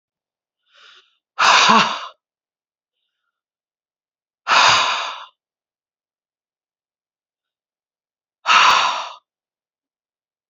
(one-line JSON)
{"exhalation_length": "10.5 s", "exhalation_amplitude": 29176, "exhalation_signal_mean_std_ratio": 0.32, "survey_phase": "beta (2021-08-13 to 2022-03-07)", "age": "45-64", "gender": "Female", "wearing_mask": "No", "symptom_cough_any": true, "symptom_runny_or_blocked_nose": true, "symptom_fatigue": true, "symptom_fever_high_temperature": true, "symptom_headache": true, "symptom_change_to_sense_of_smell_or_taste": true, "symptom_loss_of_taste": true, "symptom_other": true, "symptom_onset": "4 days", "smoker_status": "Ex-smoker", "respiratory_condition_asthma": false, "respiratory_condition_other": false, "recruitment_source": "Test and Trace", "submission_delay": "3 days", "covid_test_result": "Positive", "covid_test_method": "RT-qPCR", "covid_ct_value": 19.5, "covid_ct_gene": "ORF1ab gene", "covid_ct_mean": 19.7, "covid_viral_load": "340000 copies/ml", "covid_viral_load_category": "Low viral load (10K-1M copies/ml)"}